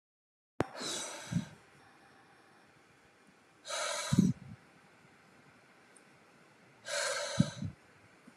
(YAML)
exhalation_length: 8.4 s
exhalation_amplitude: 8508
exhalation_signal_mean_std_ratio: 0.37
survey_phase: alpha (2021-03-01 to 2021-08-12)
age: 18-44
gender: Male
wearing_mask: 'No'
symptom_none: true
smoker_status: Never smoked
respiratory_condition_asthma: false
respiratory_condition_other: false
recruitment_source: REACT
submission_delay: 2 days
covid_test_result: Negative
covid_test_method: RT-qPCR